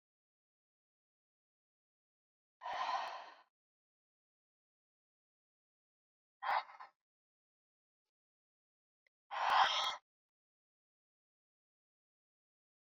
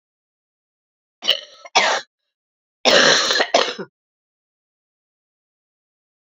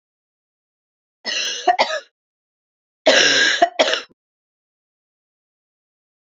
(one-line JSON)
{"exhalation_length": "13.0 s", "exhalation_amplitude": 3837, "exhalation_signal_mean_std_ratio": 0.24, "cough_length": "6.4 s", "cough_amplitude": 31018, "cough_signal_mean_std_ratio": 0.33, "three_cough_length": "6.2 s", "three_cough_amplitude": 30973, "three_cough_signal_mean_std_ratio": 0.35, "survey_phase": "beta (2021-08-13 to 2022-03-07)", "age": "45-64", "gender": "Female", "wearing_mask": "No", "symptom_new_continuous_cough": true, "symptom_runny_or_blocked_nose": true, "symptom_sore_throat": true, "symptom_abdominal_pain": true, "symptom_fatigue": true, "symptom_headache": true, "symptom_other": true, "symptom_onset": "4 days", "smoker_status": "Never smoked", "respiratory_condition_asthma": false, "respiratory_condition_other": false, "recruitment_source": "Test and Trace", "submission_delay": "1 day", "covid_test_result": "Positive", "covid_test_method": "RT-qPCR", "covid_ct_value": 16.4, "covid_ct_gene": "ORF1ab gene", "covid_ct_mean": 17.0, "covid_viral_load": "2700000 copies/ml", "covid_viral_load_category": "High viral load (>1M copies/ml)"}